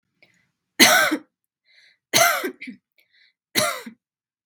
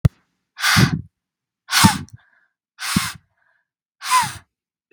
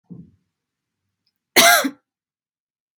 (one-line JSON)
{"three_cough_length": "4.5 s", "three_cough_amplitude": 32768, "three_cough_signal_mean_std_ratio": 0.35, "exhalation_length": "4.9 s", "exhalation_amplitude": 32765, "exhalation_signal_mean_std_ratio": 0.36, "cough_length": "3.0 s", "cough_amplitude": 32768, "cough_signal_mean_std_ratio": 0.26, "survey_phase": "beta (2021-08-13 to 2022-03-07)", "age": "18-44", "gender": "Female", "wearing_mask": "No", "symptom_none": true, "smoker_status": "Never smoked", "respiratory_condition_asthma": false, "respiratory_condition_other": false, "recruitment_source": "REACT", "submission_delay": "2 days", "covid_test_result": "Negative", "covid_test_method": "RT-qPCR", "influenza_a_test_result": "Negative", "influenza_b_test_result": "Negative"}